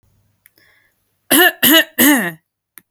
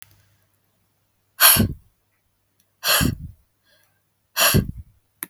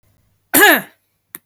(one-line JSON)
{"three_cough_length": "2.9 s", "three_cough_amplitude": 32768, "three_cough_signal_mean_std_ratio": 0.41, "exhalation_length": "5.3 s", "exhalation_amplitude": 32768, "exhalation_signal_mean_std_ratio": 0.33, "cough_length": "1.5 s", "cough_amplitude": 32768, "cough_signal_mean_std_ratio": 0.36, "survey_phase": "beta (2021-08-13 to 2022-03-07)", "age": "18-44", "gender": "Female", "wearing_mask": "No", "symptom_none": true, "smoker_status": "Never smoked", "respiratory_condition_asthma": false, "respiratory_condition_other": false, "recruitment_source": "REACT", "submission_delay": "1 day", "covid_test_result": "Negative", "covid_test_method": "RT-qPCR", "influenza_a_test_result": "Negative", "influenza_b_test_result": "Negative"}